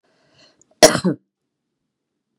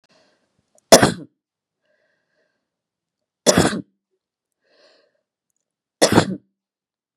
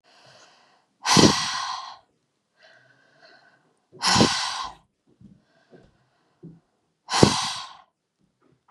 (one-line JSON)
{"cough_length": "2.4 s", "cough_amplitude": 32768, "cough_signal_mean_std_ratio": 0.21, "three_cough_length": "7.2 s", "three_cough_amplitude": 32768, "three_cough_signal_mean_std_ratio": 0.22, "exhalation_length": "8.7 s", "exhalation_amplitude": 32768, "exhalation_signal_mean_std_ratio": 0.32, "survey_phase": "beta (2021-08-13 to 2022-03-07)", "age": "45-64", "gender": "Female", "wearing_mask": "No", "symptom_none": true, "smoker_status": "Current smoker (e-cigarettes or vapes only)", "respiratory_condition_asthma": false, "respiratory_condition_other": false, "recruitment_source": "REACT", "submission_delay": "1 day", "covid_test_result": "Negative", "covid_test_method": "RT-qPCR", "influenza_a_test_result": "Negative", "influenza_b_test_result": "Negative"}